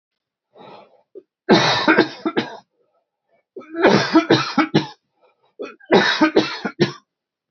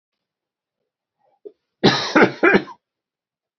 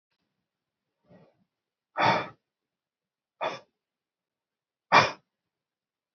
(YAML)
three_cough_length: 7.5 s
three_cough_amplitude: 32768
three_cough_signal_mean_std_ratio: 0.44
cough_length: 3.6 s
cough_amplitude: 28085
cough_signal_mean_std_ratio: 0.31
exhalation_length: 6.1 s
exhalation_amplitude: 20245
exhalation_signal_mean_std_ratio: 0.22
survey_phase: beta (2021-08-13 to 2022-03-07)
age: 45-64
gender: Male
wearing_mask: 'No'
symptom_none: true
smoker_status: Never smoked
respiratory_condition_asthma: false
respiratory_condition_other: false
recruitment_source: REACT
submission_delay: 2 days
covid_test_result: Negative
covid_test_method: RT-qPCR
influenza_a_test_result: Negative
influenza_b_test_result: Negative